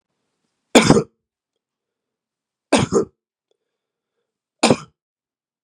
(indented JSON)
{
  "three_cough_length": "5.6 s",
  "three_cough_amplitude": 32768,
  "three_cough_signal_mean_std_ratio": 0.25,
  "survey_phase": "beta (2021-08-13 to 2022-03-07)",
  "age": "45-64",
  "gender": "Male",
  "wearing_mask": "No",
  "symptom_cough_any": true,
  "symptom_runny_or_blocked_nose": true,
  "symptom_abdominal_pain": true,
  "symptom_fatigue": true,
  "symptom_onset": "4 days",
  "smoker_status": "Ex-smoker",
  "respiratory_condition_asthma": false,
  "respiratory_condition_other": false,
  "recruitment_source": "Test and Trace",
  "submission_delay": "2 days",
  "covid_test_result": "Positive",
  "covid_test_method": "RT-qPCR",
  "covid_ct_value": 18.0,
  "covid_ct_gene": "ORF1ab gene",
  "covid_ct_mean": 18.4,
  "covid_viral_load": "920000 copies/ml",
  "covid_viral_load_category": "Low viral load (10K-1M copies/ml)"
}